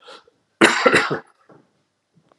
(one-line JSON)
{"cough_length": "2.4 s", "cough_amplitude": 32768, "cough_signal_mean_std_ratio": 0.35, "survey_phase": "alpha (2021-03-01 to 2021-08-12)", "age": "45-64", "gender": "Male", "wearing_mask": "No", "symptom_cough_any": true, "smoker_status": "Ex-smoker", "respiratory_condition_asthma": false, "respiratory_condition_other": false, "recruitment_source": "Test and Trace", "submission_delay": "1 day", "covid_test_result": "Positive", "covid_test_method": "RT-qPCR", "covid_ct_value": 34.3, "covid_ct_gene": "ORF1ab gene"}